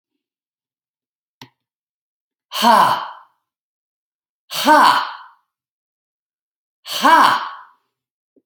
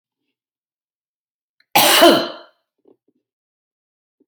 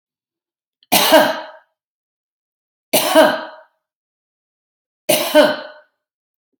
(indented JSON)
{
  "exhalation_length": "8.5 s",
  "exhalation_amplitude": 32319,
  "exhalation_signal_mean_std_ratio": 0.33,
  "cough_length": "4.3 s",
  "cough_amplitude": 30470,
  "cough_signal_mean_std_ratio": 0.27,
  "three_cough_length": "6.6 s",
  "three_cough_amplitude": 32767,
  "three_cough_signal_mean_std_ratio": 0.35,
  "survey_phase": "beta (2021-08-13 to 2022-03-07)",
  "age": "45-64",
  "gender": "Female",
  "wearing_mask": "No",
  "symptom_none": true,
  "smoker_status": "Current smoker (e-cigarettes or vapes only)",
  "respiratory_condition_asthma": false,
  "respiratory_condition_other": false,
  "recruitment_source": "REACT",
  "submission_delay": "2 days",
  "covid_test_result": "Negative",
  "covid_test_method": "RT-qPCR"
}